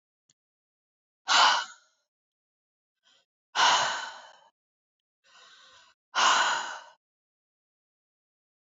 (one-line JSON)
{"exhalation_length": "8.7 s", "exhalation_amplitude": 13966, "exhalation_signal_mean_std_ratio": 0.32, "survey_phase": "beta (2021-08-13 to 2022-03-07)", "age": "45-64", "gender": "Female", "wearing_mask": "No", "symptom_runny_or_blocked_nose": true, "smoker_status": "Never smoked", "respiratory_condition_asthma": false, "respiratory_condition_other": false, "recruitment_source": "Test and Trace", "submission_delay": "-1 day", "covid_test_result": "Negative", "covid_test_method": "LFT"}